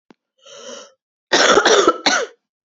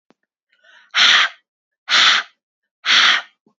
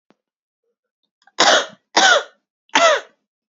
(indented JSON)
{
  "cough_length": "2.7 s",
  "cough_amplitude": 29632,
  "cough_signal_mean_std_ratio": 0.46,
  "exhalation_length": "3.6 s",
  "exhalation_amplitude": 31093,
  "exhalation_signal_mean_std_ratio": 0.45,
  "three_cough_length": "3.5 s",
  "three_cough_amplitude": 32767,
  "three_cough_signal_mean_std_ratio": 0.38,
  "survey_phase": "beta (2021-08-13 to 2022-03-07)",
  "age": "18-44",
  "gender": "Female",
  "wearing_mask": "No",
  "symptom_cough_any": true,
  "symptom_runny_or_blocked_nose": true,
  "symptom_shortness_of_breath": true,
  "symptom_sore_throat": true,
  "symptom_change_to_sense_of_smell_or_taste": true,
  "symptom_onset": "3 days",
  "smoker_status": "Never smoked",
  "respiratory_condition_asthma": false,
  "respiratory_condition_other": false,
  "recruitment_source": "Test and Trace",
  "submission_delay": "2 days",
  "covid_test_result": "Positive",
  "covid_test_method": "RT-qPCR",
  "covid_ct_value": 18.0,
  "covid_ct_gene": "ORF1ab gene",
  "covid_ct_mean": 18.6,
  "covid_viral_load": "820000 copies/ml",
  "covid_viral_load_category": "Low viral load (10K-1M copies/ml)"
}